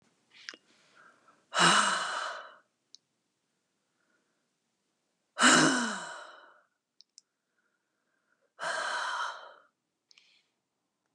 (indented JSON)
{
  "exhalation_length": "11.1 s",
  "exhalation_amplitude": 12665,
  "exhalation_signal_mean_std_ratio": 0.32,
  "survey_phase": "beta (2021-08-13 to 2022-03-07)",
  "age": "65+",
  "gender": "Female",
  "wearing_mask": "No",
  "symptom_none": true,
  "smoker_status": "Never smoked",
  "respiratory_condition_asthma": false,
  "respiratory_condition_other": false,
  "recruitment_source": "REACT",
  "submission_delay": "2 days",
  "covid_test_result": "Negative",
  "covid_test_method": "RT-qPCR",
  "influenza_a_test_result": "Negative",
  "influenza_b_test_result": "Negative"
}